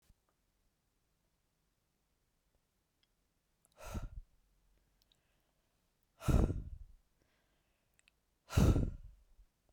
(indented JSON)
{
  "exhalation_length": "9.7 s",
  "exhalation_amplitude": 4488,
  "exhalation_signal_mean_std_ratio": 0.24,
  "survey_phase": "beta (2021-08-13 to 2022-03-07)",
  "age": "45-64",
  "gender": "Female",
  "wearing_mask": "No",
  "symptom_none": true,
  "smoker_status": "Ex-smoker",
  "respiratory_condition_asthma": false,
  "respiratory_condition_other": false,
  "recruitment_source": "REACT",
  "submission_delay": "1 day",
  "covid_test_result": "Negative",
  "covid_test_method": "RT-qPCR"
}